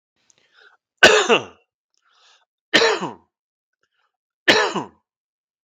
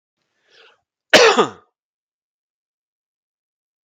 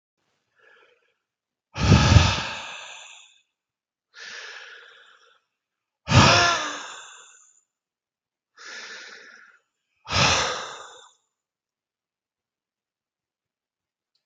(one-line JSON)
{"three_cough_length": "5.6 s", "three_cough_amplitude": 32768, "three_cough_signal_mean_std_ratio": 0.31, "cough_length": "3.8 s", "cough_amplitude": 32768, "cough_signal_mean_std_ratio": 0.23, "exhalation_length": "14.3 s", "exhalation_amplitude": 31892, "exhalation_signal_mean_std_ratio": 0.29, "survey_phase": "beta (2021-08-13 to 2022-03-07)", "age": "45-64", "gender": "Male", "wearing_mask": "No", "symptom_none": true, "smoker_status": "Never smoked", "respiratory_condition_asthma": false, "respiratory_condition_other": false, "recruitment_source": "REACT", "submission_delay": "1 day", "covid_test_result": "Negative", "covid_test_method": "RT-qPCR"}